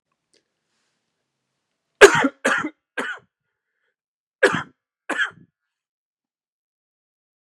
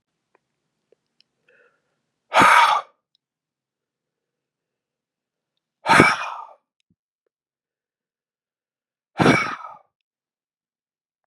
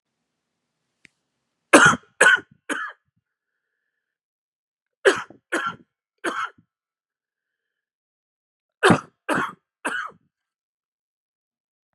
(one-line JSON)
{"cough_length": "7.6 s", "cough_amplitude": 32768, "cough_signal_mean_std_ratio": 0.21, "exhalation_length": "11.3 s", "exhalation_amplitude": 32768, "exhalation_signal_mean_std_ratio": 0.25, "three_cough_length": "11.9 s", "three_cough_amplitude": 32767, "three_cough_signal_mean_std_ratio": 0.25, "survey_phase": "beta (2021-08-13 to 2022-03-07)", "age": "45-64", "gender": "Male", "wearing_mask": "No", "symptom_cough_any": true, "symptom_runny_or_blocked_nose": true, "symptom_sore_throat": true, "symptom_abdominal_pain": true, "symptom_fatigue": true, "symptom_fever_high_temperature": true, "symptom_headache": true, "symptom_loss_of_taste": true, "symptom_onset": "6 days", "smoker_status": "Never smoked", "respiratory_condition_asthma": false, "respiratory_condition_other": false, "recruitment_source": "Test and Trace", "submission_delay": "2 days", "covid_test_result": "Positive", "covid_test_method": "ePCR"}